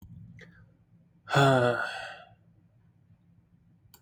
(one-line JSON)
{"exhalation_length": "4.0 s", "exhalation_amplitude": 12098, "exhalation_signal_mean_std_ratio": 0.34, "survey_phase": "beta (2021-08-13 to 2022-03-07)", "age": "18-44", "gender": "Male", "wearing_mask": "Yes", "symptom_none": true, "smoker_status": "Never smoked", "respiratory_condition_asthma": false, "respiratory_condition_other": false, "recruitment_source": "REACT", "submission_delay": "0 days", "covid_test_result": "Negative", "covid_test_method": "RT-qPCR", "influenza_a_test_result": "Negative", "influenza_b_test_result": "Negative"}